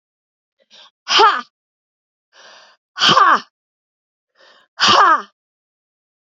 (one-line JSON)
{"exhalation_length": "6.4 s", "exhalation_amplitude": 32768, "exhalation_signal_mean_std_ratio": 0.34, "survey_phase": "beta (2021-08-13 to 2022-03-07)", "age": "45-64", "gender": "Female", "wearing_mask": "No", "symptom_cough_any": true, "symptom_runny_or_blocked_nose": true, "symptom_sore_throat": true, "symptom_fatigue": true, "symptom_onset": "4 days", "smoker_status": "Never smoked", "respiratory_condition_asthma": false, "respiratory_condition_other": false, "recruitment_source": "Test and Trace", "submission_delay": "2 days", "covid_test_result": "Positive", "covid_test_method": "ePCR"}